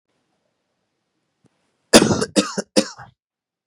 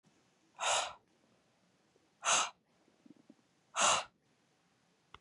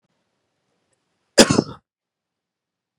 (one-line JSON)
{"three_cough_length": "3.7 s", "three_cough_amplitude": 32768, "three_cough_signal_mean_std_ratio": 0.26, "exhalation_length": "5.2 s", "exhalation_amplitude": 5864, "exhalation_signal_mean_std_ratio": 0.32, "cough_length": "3.0 s", "cough_amplitude": 32768, "cough_signal_mean_std_ratio": 0.18, "survey_phase": "beta (2021-08-13 to 2022-03-07)", "age": "18-44", "gender": "Male", "wearing_mask": "No", "symptom_cough_any": true, "symptom_sore_throat": true, "symptom_onset": "12 days", "smoker_status": "Never smoked", "respiratory_condition_asthma": false, "respiratory_condition_other": false, "recruitment_source": "REACT", "submission_delay": "1 day", "covid_test_result": "Positive", "covid_test_method": "RT-qPCR", "covid_ct_value": 36.0, "covid_ct_gene": "N gene", "influenza_a_test_result": "Negative", "influenza_b_test_result": "Negative"}